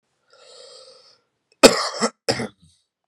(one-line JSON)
{"three_cough_length": "3.1 s", "three_cough_amplitude": 32768, "three_cough_signal_mean_std_ratio": 0.25, "survey_phase": "beta (2021-08-13 to 2022-03-07)", "age": "18-44", "gender": "Male", "wearing_mask": "No", "symptom_cough_any": true, "symptom_shortness_of_breath": true, "symptom_diarrhoea": true, "symptom_fever_high_temperature": true, "symptom_change_to_sense_of_smell_or_taste": true, "symptom_onset": "4 days", "smoker_status": "Never smoked", "respiratory_condition_asthma": false, "respiratory_condition_other": false, "recruitment_source": "Test and Trace", "submission_delay": "1 day", "covid_test_result": "Positive", "covid_test_method": "RT-qPCR"}